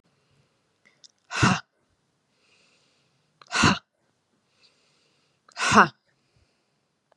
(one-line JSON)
{"exhalation_length": "7.2 s", "exhalation_amplitude": 28671, "exhalation_signal_mean_std_ratio": 0.24, "survey_phase": "beta (2021-08-13 to 2022-03-07)", "age": "18-44", "gender": "Female", "wearing_mask": "No", "symptom_none": true, "smoker_status": "Never smoked", "respiratory_condition_asthma": false, "respiratory_condition_other": false, "recruitment_source": "REACT", "submission_delay": "1 day", "covid_test_result": "Negative", "covid_test_method": "RT-qPCR", "influenza_a_test_result": "Negative", "influenza_b_test_result": "Negative"}